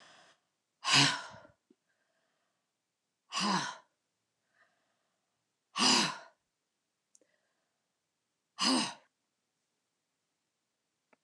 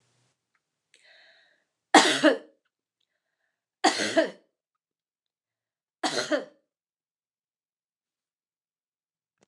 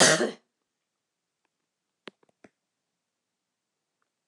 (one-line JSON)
{"exhalation_length": "11.2 s", "exhalation_amplitude": 8184, "exhalation_signal_mean_std_ratio": 0.28, "three_cough_length": "9.5 s", "three_cough_amplitude": 25463, "three_cough_signal_mean_std_ratio": 0.23, "cough_length": "4.3 s", "cough_amplitude": 17327, "cough_signal_mean_std_ratio": 0.19, "survey_phase": "beta (2021-08-13 to 2022-03-07)", "age": "65+", "gender": "Female", "wearing_mask": "No", "symptom_none": true, "smoker_status": "Never smoked", "respiratory_condition_asthma": false, "respiratory_condition_other": false, "recruitment_source": "REACT", "submission_delay": "1 day", "covid_test_result": "Negative", "covid_test_method": "RT-qPCR"}